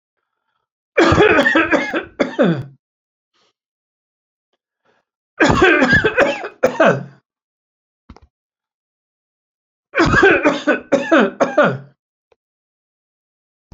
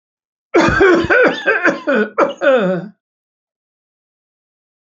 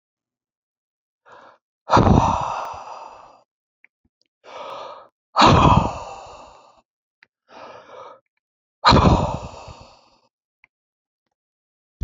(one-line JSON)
{"three_cough_length": "13.7 s", "three_cough_amplitude": 32768, "three_cough_signal_mean_std_ratio": 0.44, "cough_length": "4.9 s", "cough_amplitude": 32767, "cough_signal_mean_std_ratio": 0.54, "exhalation_length": "12.0 s", "exhalation_amplitude": 29448, "exhalation_signal_mean_std_ratio": 0.33, "survey_phase": "alpha (2021-03-01 to 2021-08-12)", "age": "65+", "gender": "Male", "wearing_mask": "No", "symptom_none": true, "smoker_status": "Never smoked", "respiratory_condition_asthma": false, "respiratory_condition_other": false, "recruitment_source": "REACT", "submission_delay": "3 days", "covid_test_result": "Negative", "covid_test_method": "RT-qPCR"}